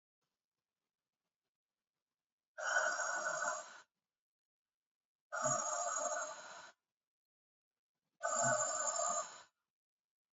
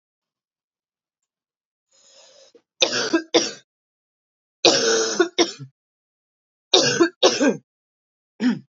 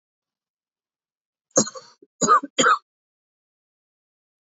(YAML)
exhalation_length: 10.3 s
exhalation_amplitude: 2551
exhalation_signal_mean_std_ratio: 0.47
three_cough_length: 8.8 s
three_cough_amplitude: 32767
three_cough_signal_mean_std_ratio: 0.37
cough_length: 4.4 s
cough_amplitude: 25076
cough_signal_mean_std_ratio: 0.26
survey_phase: beta (2021-08-13 to 2022-03-07)
age: 18-44
gender: Female
wearing_mask: 'No'
symptom_cough_any: true
symptom_runny_or_blocked_nose: true
symptom_shortness_of_breath: true
symptom_sore_throat: true
symptom_diarrhoea: true
symptom_fatigue: true
symptom_fever_high_temperature: true
symptom_headache: true
symptom_change_to_sense_of_smell_or_taste: true
symptom_loss_of_taste: true
symptom_onset: 3 days
smoker_status: Never smoked
respiratory_condition_asthma: false
respiratory_condition_other: false
recruitment_source: Test and Trace
submission_delay: 1 day
covid_test_result: Positive
covid_test_method: RT-qPCR
covid_ct_value: 18.2
covid_ct_gene: ORF1ab gene
covid_ct_mean: 18.8
covid_viral_load: 680000 copies/ml
covid_viral_load_category: Low viral load (10K-1M copies/ml)